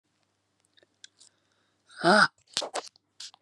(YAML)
exhalation_length: 3.4 s
exhalation_amplitude: 18209
exhalation_signal_mean_std_ratio: 0.25
survey_phase: alpha (2021-03-01 to 2021-08-12)
age: 45-64
gender: Female
wearing_mask: 'No'
symptom_cough_any: true
symptom_new_continuous_cough: true
symptom_abdominal_pain: true
symptom_fatigue: true
symptom_headache: true
symptom_change_to_sense_of_smell_or_taste: true
symptom_loss_of_taste: true
symptom_onset: 3 days
smoker_status: Ex-smoker
respiratory_condition_asthma: false
respiratory_condition_other: false
recruitment_source: Test and Trace
submission_delay: 1 day
covid_test_result: Positive
covid_test_method: RT-qPCR
covid_ct_value: 18.7
covid_ct_gene: ORF1ab gene